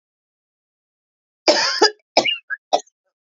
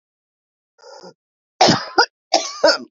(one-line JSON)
{"three_cough_length": "3.3 s", "three_cough_amplitude": 29054, "three_cough_signal_mean_std_ratio": 0.33, "cough_length": "2.9 s", "cough_amplitude": 32554, "cough_signal_mean_std_ratio": 0.36, "survey_phase": "beta (2021-08-13 to 2022-03-07)", "age": "45-64", "gender": "Female", "wearing_mask": "No", "symptom_runny_or_blocked_nose": true, "symptom_change_to_sense_of_smell_or_taste": true, "symptom_onset": "2 days", "smoker_status": "Current smoker (1 to 10 cigarettes per day)", "respiratory_condition_asthma": false, "respiratory_condition_other": false, "recruitment_source": "Test and Trace", "submission_delay": "1 day", "covid_test_result": "Positive", "covid_test_method": "RT-qPCR", "covid_ct_value": 18.3, "covid_ct_gene": "ORF1ab gene"}